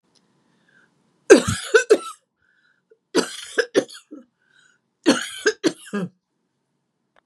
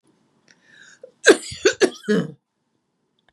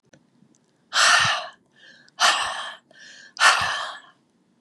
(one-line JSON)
{"three_cough_length": "7.3 s", "three_cough_amplitude": 32768, "three_cough_signal_mean_std_ratio": 0.28, "cough_length": "3.3 s", "cough_amplitude": 32719, "cough_signal_mean_std_ratio": 0.28, "exhalation_length": "4.6 s", "exhalation_amplitude": 25867, "exhalation_signal_mean_std_ratio": 0.44, "survey_phase": "beta (2021-08-13 to 2022-03-07)", "age": "65+", "gender": "Female", "wearing_mask": "No", "symptom_none": true, "smoker_status": "Ex-smoker", "respiratory_condition_asthma": true, "respiratory_condition_other": false, "recruitment_source": "REACT", "submission_delay": "2 days", "covid_test_result": "Negative", "covid_test_method": "RT-qPCR", "influenza_a_test_result": "Negative", "influenza_b_test_result": "Negative"}